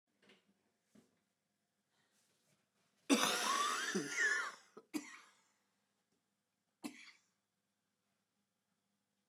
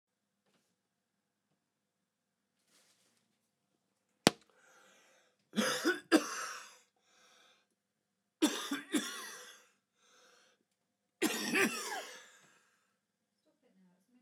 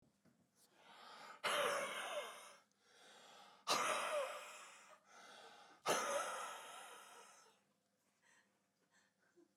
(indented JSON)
{
  "cough_length": "9.3 s",
  "cough_amplitude": 4297,
  "cough_signal_mean_std_ratio": 0.33,
  "three_cough_length": "14.2 s",
  "three_cough_amplitude": 23646,
  "three_cough_signal_mean_std_ratio": 0.28,
  "exhalation_length": "9.6 s",
  "exhalation_amplitude": 2176,
  "exhalation_signal_mean_std_ratio": 0.48,
  "survey_phase": "beta (2021-08-13 to 2022-03-07)",
  "age": "45-64",
  "gender": "Male",
  "wearing_mask": "No",
  "symptom_cough_any": true,
  "symptom_shortness_of_breath": true,
  "symptom_fatigue": true,
  "symptom_headache": true,
  "symptom_change_to_sense_of_smell_or_taste": true,
  "symptom_onset": "4 days",
  "smoker_status": "Ex-smoker",
  "respiratory_condition_asthma": false,
  "respiratory_condition_other": false,
  "recruitment_source": "Test and Trace",
  "submission_delay": "2 days",
  "covid_test_result": "Positive",
  "covid_test_method": "RT-qPCR"
}